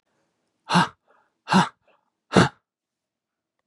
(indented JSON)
{
  "exhalation_length": "3.7 s",
  "exhalation_amplitude": 28568,
  "exhalation_signal_mean_std_ratio": 0.28,
  "survey_phase": "beta (2021-08-13 to 2022-03-07)",
  "age": "65+",
  "gender": "Male",
  "wearing_mask": "No",
  "symptom_none": true,
  "smoker_status": "Never smoked",
  "respiratory_condition_asthma": false,
  "respiratory_condition_other": false,
  "recruitment_source": "REACT",
  "submission_delay": "1 day",
  "covid_test_result": "Negative",
  "covid_test_method": "RT-qPCR",
  "influenza_a_test_result": "Negative",
  "influenza_b_test_result": "Negative"
}